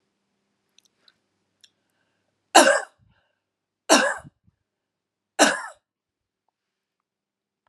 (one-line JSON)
{"three_cough_length": "7.7 s", "three_cough_amplitude": 32748, "three_cough_signal_mean_std_ratio": 0.22, "survey_phase": "alpha (2021-03-01 to 2021-08-12)", "age": "45-64", "gender": "Female", "wearing_mask": "No", "symptom_none": true, "symptom_onset": "4 days", "smoker_status": "Never smoked", "respiratory_condition_asthma": false, "respiratory_condition_other": false, "recruitment_source": "REACT", "submission_delay": "1 day", "covid_test_result": "Negative", "covid_test_method": "RT-qPCR"}